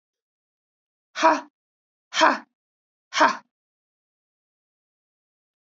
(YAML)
exhalation_length: 5.7 s
exhalation_amplitude: 23787
exhalation_signal_mean_std_ratio: 0.24
survey_phase: beta (2021-08-13 to 2022-03-07)
age: 65+
gender: Female
wearing_mask: 'No'
symptom_runny_or_blocked_nose: true
symptom_change_to_sense_of_smell_or_taste: true
symptom_loss_of_taste: true
symptom_onset: 4 days
smoker_status: Never smoked
respiratory_condition_asthma: false
respiratory_condition_other: false
recruitment_source: Test and Trace
submission_delay: 2 days
covid_test_result: Positive
covid_test_method: RT-qPCR